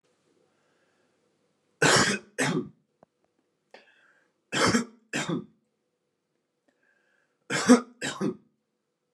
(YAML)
three_cough_length: 9.1 s
three_cough_amplitude: 16545
three_cough_signal_mean_std_ratio: 0.31
survey_phase: beta (2021-08-13 to 2022-03-07)
age: 18-44
gender: Male
wearing_mask: 'No'
symptom_cough_any: true
symptom_sore_throat: true
symptom_fatigue: true
symptom_headache: true
symptom_onset: 2 days
smoker_status: Never smoked
respiratory_condition_asthma: false
respiratory_condition_other: false
recruitment_source: Test and Trace
submission_delay: 1 day
covid_test_result: Positive
covid_test_method: ePCR